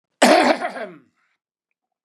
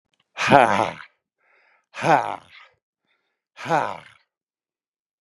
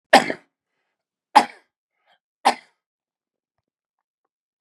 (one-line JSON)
{"cough_length": "2.0 s", "cough_amplitude": 32352, "cough_signal_mean_std_ratio": 0.38, "exhalation_length": "5.2 s", "exhalation_amplitude": 32767, "exhalation_signal_mean_std_ratio": 0.3, "three_cough_length": "4.6 s", "three_cough_amplitude": 32768, "three_cough_signal_mean_std_ratio": 0.18, "survey_phase": "beta (2021-08-13 to 2022-03-07)", "age": "65+", "gender": "Male", "wearing_mask": "No", "symptom_none": true, "smoker_status": "Ex-smoker", "respiratory_condition_asthma": false, "respiratory_condition_other": false, "recruitment_source": "REACT", "submission_delay": "2 days", "covid_test_result": "Negative", "covid_test_method": "RT-qPCR", "influenza_a_test_result": "Negative", "influenza_b_test_result": "Negative"}